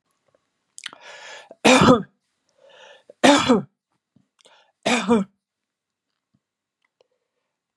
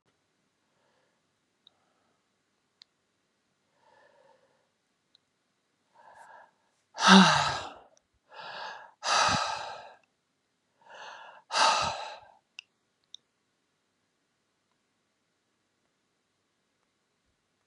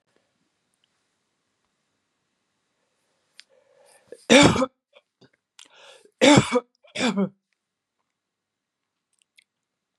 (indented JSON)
{
  "three_cough_length": "7.8 s",
  "three_cough_amplitude": 31687,
  "three_cough_signal_mean_std_ratio": 0.29,
  "exhalation_length": "17.7 s",
  "exhalation_amplitude": 20239,
  "exhalation_signal_mean_std_ratio": 0.23,
  "cough_length": "10.0 s",
  "cough_amplitude": 31669,
  "cough_signal_mean_std_ratio": 0.23,
  "survey_phase": "beta (2021-08-13 to 2022-03-07)",
  "age": "65+",
  "gender": "Female",
  "wearing_mask": "No",
  "symptom_none": true,
  "smoker_status": "Never smoked",
  "respiratory_condition_asthma": false,
  "respiratory_condition_other": false,
  "recruitment_source": "REACT",
  "submission_delay": "1 day",
  "covid_test_result": "Negative",
  "covid_test_method": "RT-qPCR"
}